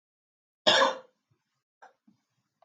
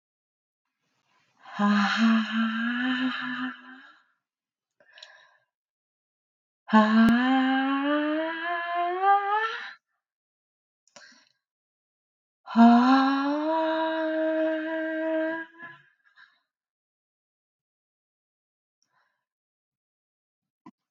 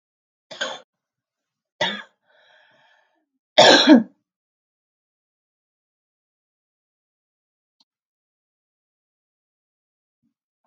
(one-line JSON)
{"cough_length": "2.6 s", "cough_amplitude": 16392, "cough_signal_mean_std_ratio": 0.26, "exhalation_length": "20.9 s", "exhalation_amplitude": 18343, "exhalation_signal_mean_std_ratio": 0.5, "three_cough_length": "10.7 s", "three_cough_amplitude": 32768, "three_cough_signal_mean_std_ratio": 0.18, "survey_phase": "beta (2021-08-13 to 2022-03-07)", "age": "18-44", "gender": "Female", "wearing_mask": "Yes", "symptom_none": true, "smoker_status": "Ex-smoker", "respiratory_condition_asthma": false, "respiratory_condition_other": false, "recruitment_source": "REACT", "submission_delay": "6 days", "covid_test_result": "Negative", "covid_test_method": "RT-qPCR", "influenza_a_test_result": "Negative", "influenza_b_test_result": "Negative"}